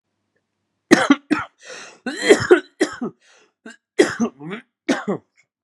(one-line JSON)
{"cough_length": "5.6 s", "cough_amplitude": 32768, "cough_signal_mean_std_ratio": 0.35, "survey_phase": "alpha (2021-03-01 to 2021-08-12)", "age": "18-44", "gender": "Male", "wearing_mask": "No", "symptom_cough_any": true, "symptom_new_continuous_cough": true, "symptom_fever_high_temperature": true, "symptom_onset": "2 days", "smoker_status": "Never smoked", "respiratory_condition_asthma": false, "respiratory_condition_other": false, "recruitment_source": "Test and Trace", "submission_delay": "2 days", "covid_test_result": "Positive", "covid_test_method": "RT-qPCR"}